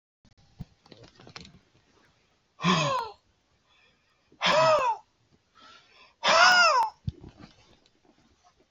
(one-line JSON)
{"exhalation_length": "8.7 s", "exhalation_amplitude": 15227, "exhalation_signal_mean_std_ratio": 0.37, "survey_phase": "beta (2021-08-13 to 2022-03-07)", "age": "65+", "gender": "Male", "wearing_mask": "No", "symptom_none": true, "symptom_onset": "4 days", "smoker_status": "Ex-smoker", "respiratory_condition_asthma": false, "respiratory_condition_other": false, "recruitment_source": "REACT", "submission_delay": "5 days", "covid_test_result": "Negative", "covid_test_method": "RT-qPCR", "influenza_a_test_result": "Negative", "influenza_b_test_result": "Negative"}